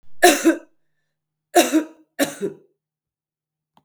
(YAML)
three_cough_length: 3.8 s
three_cough_amplitude: 32768
three_cough_signal_mean_std_ratio: 0.34
survey_phase: beta (2021-08-13 to 2022-03-07)
age: 45-64
gender: Female
wearing_mask: 'No'
symptom_cough_any: true
symptom_runny_or_blocked_nose: true
symptom_sore_throat: true
symptom_fatigue: true
symptom_headache: true
smoker_status: Never smoked
respiratory_condition_asthma: false
respiratory_condition_other: false
recruitment_source: Test and Trace
submission_delay: 2 days
covid_test_result: Positive
covid_test_method: RT-qPCR
covid_ct_value: 25.3
covid_ct_gene: ORF1ab gene
covid_ct_mean: 25.8
covid_viral_load: 3500 copies/ml
covid_viral_load_category: Minimal viral load (< 10K copies/ml)